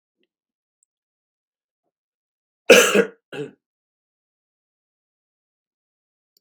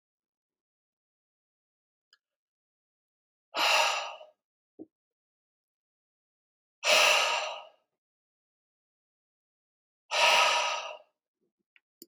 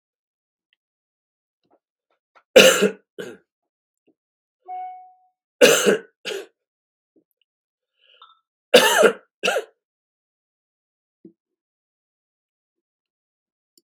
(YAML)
cough_length: 6.4 s
cough_amplitude: 32767
cough_signal_mean_std_ratio: 0.18
exhalation_length: 12.1 s
exhalation_amplitude: 10153
exhalation_signal_mean_std_ratio: 0.31
three_cough_length: 13.8 s
three_cough_amplitude: 32768
three_cough_signal_mean_std_ratio: 0.23
survey_phase: beta (2021-08-13 to 2022-03-07)
age: 45-64
gender: Male
wearing_mask: 'No'
symptom_none: true
smoker_status: Never smoked
respiratory_condition_asthma: false
respiratory_condition_other: false
recruitment_source: REACT
submission_delay: 4 days
covid_test_result: Negative
covid_test_method: RT-qPCR
influenza_a_test_result: Negative
influenza_b_test_result: Negative